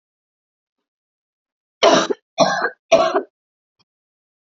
{"three_cough_length": "4.5 s", "three_cough_amplitude": 29223, "three_cough_signal_mean_std_ratio": 0.33, "survey_phase": "beta (2021-08-13 to 2022-03-07)", "age": "18-44", "gender": "Female", "wearing_mask": "No", "symptom_none": true, "smoker_status": "Never smoked", "respiratory_condition_asthma": false, "respiratory_condition_other": false, "recruitment_source": "REACT", "submission_delay": "1 day", "covid_test_result": "Negative", "covid_test_method": "RT-qPCR"}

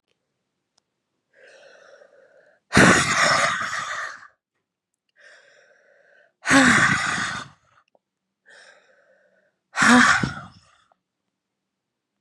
{"exhalation_length": "12.2 s", "exhalation_amplitude": 30247, "exhalation_signal_mean_std_ratio": 0.36, "survey_phase": "beta (2021-08-13 to 2022-03-07)", "age": "18-44", "gender": "Female", "wearing_mask": "No", "symptom_cough_any": true, "symptom_runny_or_blocked_nose": true, "symptom_headache": true, "symptom_change_to_sense_of_smell_or_taste": true, "symptom_onset": "4 days", "smoker_status": "Never smoked", "respiratory_condition_asthma": false, "respiratory_condition_other": false, "recruitment_source": "Test and Trace", "submission_delay": "1 day", "covid_test_result": "Positive", "covid_test_method": "RT-qPCR", "covid_ct_value": 22.6, "covid_ct_gene": "N gene"}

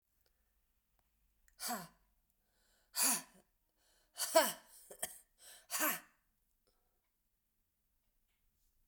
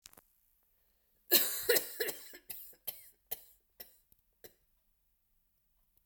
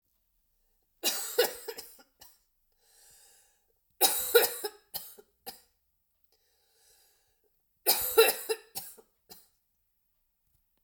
{"exhalation_length": "8.9 s", "exhalation_amplitude": 6397, "exhalation_signal_mean_std_ratio": 0.26, "cough_length": "6.1 s", "cough_amplitude": 9812, "cough_signal_mean_std_ratio": 0.27, "three_cough_length": "10.8 s", "three_cough_amplitude": 14256, "three_cough_signal_mean_std_ratio": 0.28, "survey_phase": "beta (2021-08-13 to 2022-03-07)", "age": "45-64", "gender": "Female", "wearing_mask": "No", "symptom_cough_any": true, "symptom_new_continuous_cough": true, "symptom_runny_or_blocked_nose": true, "symptom_shortness_of_breath": true, "symptom_fatigue": true, "symptom_headache": true, "symptom_loss_of_taste": true, "symptom_other": true, "symptom_onset": "3 days", "smoker_status": "Never smoked", "respiratory_condition_asthma": false, "respiratory_condition_other": false, "recruitment_source": "Test and Trace", "submission_delay": "1 day", "covid_test_result": "Positive", "covid_test_method": "RT-qPCR", "covid_ct_value": 18.1, "covid_ct_gene": "ORF1ab gene", "covid_ct_mean": 18.7, "covid_viral_load": "730000 copies/ml", "covid_viral_load_category": "Low viral load (10K-1M copies/ml)"}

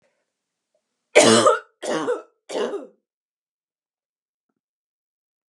{"three_cough_length": "5.5 s", "three_cough_amplitude": 32768, "three_cough_signal_mean_std_ratio": 0.3, "survey_phase": "beta (2021-08-13 to 2022-03-07)", "age": "18-44", "gender": "Female", "wearing_mask": "No", "symptom_none": true, "smoker_status": "Never smoked", "respiratory_condition_asthma": false, "respiratory_condition_other": false, "recruitment_source": "REACT", "submission_delay": "2 days", "covid_test_result": "Negative", "covid_test_method": "RT-qPCR", "influenza_a_test_result": "Negative", "influenza_b_test_result": "Negative"}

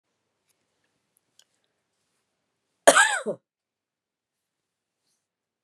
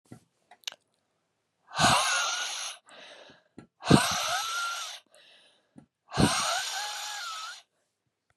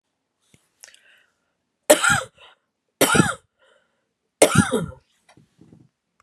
{"cough_length": "5.6 s", "cough_amplitude": 32767, "cough_signal_mean_std_ratio": 0.17, "exhalation_length": "8.4 s", "exhalation_amplitude": 24366, "exhalation_signal_mean_std_ratio": 0.46, "three_cough_length": "6.2 s", "three_cough_amplitude": 32768, "three_cough_signal_mean_std_ratio": 0.29, "survey_phase": "beta (2021-08-13 to 2022-03-07)", "age": "65+", "gender": "Female", "wearing_mask": "No", "symptom_cough_any": true, "symptom_runny_or_blocked_nose": true, "symptom_headache": true, "symptom_onset": "3 days", "smoker_status": "Never smoked", "respiratory_condition_asthma": false, "respiratory_condition_other": false, "recruitment_source": "Test and Trace", "submission_delay": "2 days", "covid_test_result": "Positive", "covid_test_method": "RT-qPCR", "covid_ct_value": 25.8, "covid_ct_gene": "ORF1ab gene"}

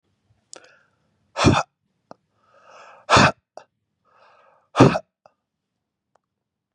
{"exhalation_length": "6.7 s", "exhalation_amplitude": 32767, "exhalation_signal_mean_std_ratio": 0.24, "survey_phase": "beta (2021-08-13 to 2022-03-07)", "age": "45-64", "gender": "Male", "wearing_mask": "No", "symptom_fatigue": true, "symptom_onset": "12 days", "smoker_status": "Ex-smoker", "respiratory_condition_asthma": false, "respiratory_condition_other": false, "recruitment_source": "REACT", "submission_delay": "9 days", "covid_test_result": "Negative", "covid_test_method": "RT-qPCR", "influenza_a_test_result": "Negative", "influenza_b_test_result": "Negative"}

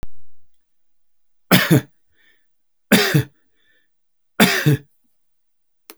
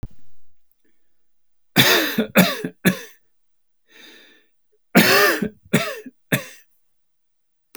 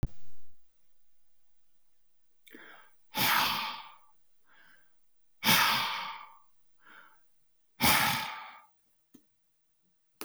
{"three_cough_length": "6.0 s", "three_cough_amplitude": 32768, "three_cough_signal_mean_std_ratio": 0.36, "cough_length": "7.8 s", "cough_amplitude": 32767, "cough_signal_mean_std_ratio": 0.38, "exhalation_length": "10.2 s", "exhalation_amplitude": 9796, "exhalation_signal_mean_std_ratio": 0.43, "survey_phase": "alpha (2021-03-01 to 2021-08-12)", "age": "65+", "gender": "Male", "wearing_mask": "No", "symptom_none": true, "smoker_status": "Never smoked", "respiratory_condition_asthma": true, "respiratory_condition_other": false, "recruitment_source": "REACT", "submission_delay": "1 day", "covid_test_result": "Negative", "covid_test_method": "RT-qPCR"}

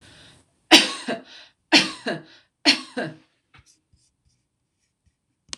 {"cough_length": "5.6 s", "cough_amplitude": 26028, "cough_signal_mean_std_ratio": 0.26, "survey_phase": "beta (2021-08-13 to 2022-03-07)", "age": "45-64", "gender": "Female", "wearing_mask": "No", "symptom_runny_or_blocked_nose": true, "smoker_status": "Never smoked", "respiratory_condition_asthma": false, "respiratory_condition_other": false, "recruitment_source": "REACT", "submission_delay": "1 day", "covid_test_result": "Negative", "covid_test_method": "RT-qPCR", "influenza_a_test_result": "Negative", "influenza_b_test_result": "Negative"}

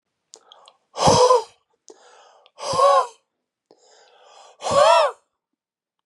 {"exhalation_length": "6.1 s", "exhalation_amplitude": 26151, "exhalation_signal_mean_std_ratio": 0.39, "survey_phase": "beta (2021-08-13 to 2022-03-07)", "age": "18-44", "gender": "Male", "wearing_mask": "No", "symptom_cough_any": true, "symptom_runny_or_blocked_nose": true, "symptom_sore_throat": true, "symptom_diarrhoea": true, "symptom_fatigue": true, "symptom_headache": true, "smoker_status": "Never smoked", "respiratory_condition_asthma": true, "respiratory_condition_other": false, "recruitment_source": "Test and Trace", "submission_delay": "2 days", "covid_test_result": "Positive", "covid_test_method": "RT-qPCR", "covid_ct_value": 21.6, "covid_ct_gene": "ORF1ab gene", "covid_ct_mean": 22.1, "covid_viral_load": "54000 copies/ml", "covid_viral_load_category": "Low viral load (10K-1M copies/ml)"}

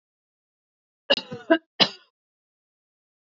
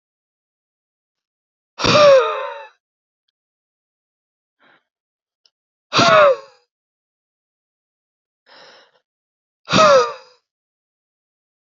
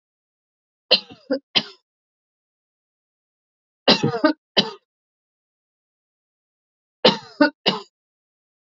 {"cough_length": "3.2 s", "cough_amplitude": 24234, "cough_signal_mean_std_ratio": 0.21, "exhalation_length": "11.8 s", "exhalation_amplitude": 28624, "exhalation_signal_mean_std_ratio": 0.28, "three_cough_length": "8.7 s", "three_cough_amplitude": 28660, "three_cough_signal_mean_std_ratio": 0.24, "survey_phase": "alpha (2021-03-01 to 2021-08-12)", "age": "45-64", "gender": "Female", "wearing_mask": "No", "symptom_none": true, "smoker_status": "Never smoked", "respiratory_condition_asthma": true, "respiratory_condition_other": false, "recruitment_source": "REACT", "submission_delay": "1 day", "covid_test_result": "Negative", "covid_test_method": "RT-qPCR"}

